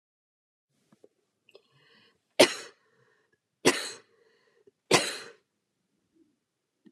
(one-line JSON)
{"three_cough_length": "6.9 s", "three_cough_amplitude": 21329, "three_cough_signal_mean_std_ratio": 0.19, "survey_phase": "beta (2021-08-13 to 2022-03-07)", "age": "45-64", "gender": "Female", "wearing_mask": "No", "symptom_fatigue": true, "smoker_status": "Ex-smoker", "respiratory_condition_asthma": false, "respiratory_condition_other": false, "recruitment_source": "REACT", "submission_delay": "1 day", "covid_test_result": "Negative", "covid_test_method": "RT-qPCR"}